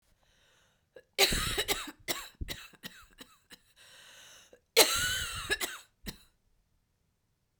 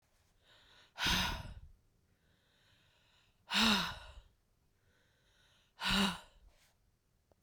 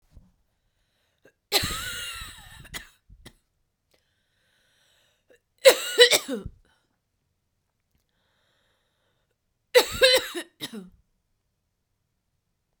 {"cough_length": "7.6 s", "cough_amplitude": 16242, "cough_signal_mean_std_ratio": 0.35, "exhalation_length": "7.4 s", "exhalation_amplitude": 6053, "exhalation_signal_mean_std_ratio": 0.35, "three_cough_length": "12.8 s", "three_cough_amplitude": 31265, "three_cough_signal_mean_std_ratio": 0.23, "survey_phase": "beta (2021-08-13 to 2022-03-07)", "age": "45-64", "gender": "Female", "wearing_mask": "No", "symptom_cough_any": true, "symptom_runny_or_blocked_nose": true, "symptom_sore_throat": true, "symptom_fatigue": true, "symptom_fever_high_temperature": true, "symptom_headache": true, "symptom_change_to_sense_of_smell_or_taste": true, "symptom_other": true, "symptom_onset": "4 days", "smoker_status": "Ex-smoker", "respiratory_condition_asthma": false, "respiratory_condition_other": false, "recruitment_source": "Test and Trace", "submission_delay": "1 day", "covid_test_result": "Positive", "covid_test_method": "RT-qPCR"}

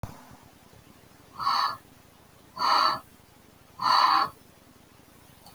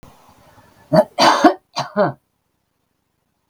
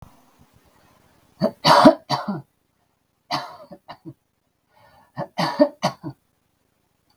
{"exhalation_length": "5.5 s", "exhalation_amplitude": 11502, "exhalation_signal_mean_std_ratio": 0.42, "cough_length": "3.5 s", "cough_amplitude": 32768, "cough_signal_mean_std_ratio": 0.34, "three_cough_length": "7.2 s", "three_cough_amplitude": 32768, "three_cough_signal_mean_std_ratio": 0.28, "survey_phase": "beta (2021-08-13 to 2022-03-07)", "age": "45-64", "gender": "Female", "wearing_mask": "No", "symptom_headache": true, "smoker_status": "Ex-smoker", "respiratory_condition_asthma": false, "respiratory_condition_other": false, "recruitment_source": "REACT", "submission_delay": "1 day", "covid_test_result": "Negative", "covid_test_method": "RT-qPCR"}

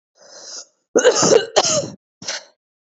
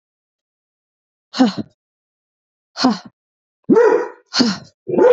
{"cough_length": "3.0 s", "cough_amplitude": 27653, "cough_signal_mean_std_ratio": 0.43, "exhalation_length": "5.1 s", "exhalation_amplitude": 27749, "exhalation_signal_mean_std_ratio": 0.39, "survey_phase": "beta (2021-08-13 to 2022-03-07)", "age": "18-44", "gender": "Female", "wearing_mask": "No", "symptom_cough_any": true, "symptom_sore_throat": true, "symptom_fatigue": true, "symptom_headache": true, "smoker_status": "Current smoker (e-cigarettes or vapes only)", "respiratory_condition_asthma": false, "respiratory_condition_other": false, "recruitment_source": "Test and Trace", "submission_delay": "2 days", "covid_test_result": "Positive", "covid_test_method": "RT-qPCR"}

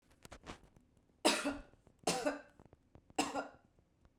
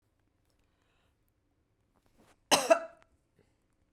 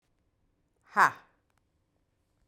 {"three_cough_length": "4.2 s", "three_cough_amplitude": 5626, "three_cough_signal_mean_std_ratio": 0.37, "cough_length": "3.9 s", "cough_amplitude": 15987, "cough_signal_mean_std_ratio": 0.19, "exhalation_length": "2.5 s", "exhalation_amplitude": 13098, "exhalation_signal_mean_std_ratio": 0.17, "survey_phase": "beta (2021-08-13 to 2022-03-07)", "age": "45-64", "gender": "Female", "wearing_mask": "No", "symptom_none": true, "smoker_status": "Ex-smoker", "respiratory_condition_asthma": false, "respiratory_condition_other": false, "recruitment_source": "REACT", "submission_delay": "1 day", "covid_test_result": "Negative", "covid_test_method": "RT-qPCR", "influenza_a_test_result": "Negative", "influenza_b_test_result": "Negative"}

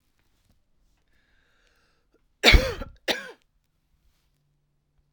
{"cough_length": "5.1 s", "cough_amplitude": 32768, "cough_signal_mean_std_ratio": 0.19, "survey_phase": "alpha (2021-03-01 to 2021-08-12)", "age": "45-64", "gender": "Female", "wearing_mask": "No", "symptom_shortness_of_breath": true, "symptom_fatigue": true, "symptom_headache": true, "smoker_status": "Ex-smoker", "respiratory_condition_asthma": true, "respiratory_condition_other": false, "recruitment_source": "Test and Trace", "submission_delay": "2 days", "covid_test_result": "Positive", "covid_test_method": "RT-qPCR", "covid_ct_value": 37.4, "covid_ct_gene": "ORF1ab gene"}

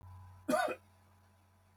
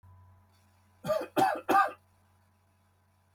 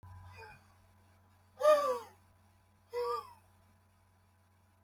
{"cough_length": "1.8 s", "cough_amplitude": 3252, "cough_signal_mean_std_ratio": 0.39, "three_cough_length": "3.3 s", "three_cough_amplitude": 6987, "three_cough_signal_mean_std_ratio": 0.36, "exhalation_length": "4.8 s", "exhalation_amplitude": 5198, "exhalation_signal_mean_std_ratio": 0.31, "survey_phase": "beta (2021-08-13 to 2022-03-07)", "age": "18-44", "gender": "Male", "wearing_mask": "No", "symptom_none": true, "smoker_status": "Never smoked", "respiratory_condition_asthma": true, "respiratory_condition_other": true, "recruitment_source": "REACT", "submission_delay": "0 days", "covid_test_result": "Negative", "covid_test_method": "RT-qPCR"}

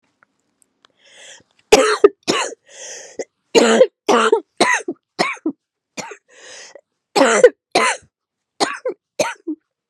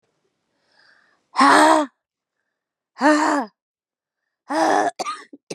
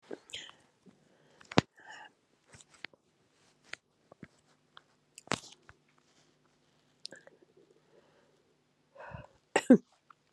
{"three_cough_length": "9.9 s", "three_cough_amplitude": 32768, "three_cough_signal_mean_std_ratio": 0.38, "exhalation_length": "5.5 s", "exhalation_amplitude": 31461, "exhalation_signal_mean_std_ratio": 0.4, "cough_length": "10.3 s", "cough_amplitude": 21687, "cough_signal_mean_std_ratio": 0.13, "survey_phase": "beta (2021-08-13 to 2022-03-07)", "age": "45-64", "gender": "Female", "wearing_mask": "No", "symptom_runny_or_blocked_nose": true, "symptom_sore_throat": true, "symptom_diarrhoea": true, "symptom_fatigue": true, "symptom_fever_high_temperature": true, "symptom_headache": true, "symptom_other": true, "symptom_onset": "4 days", "smoker_status": "Never smoked", "respiratory_condition_asthma": false, "respiratory_condition_other": false, "recruitment_source": "Test and Trace", "submission_delay": "2 days", "covid_test_result": "Positive", "covid_test_method": "RT-qPCR", "covid_ct_value": 24.7, "covid_ct_gene": "ORF1ab gene"}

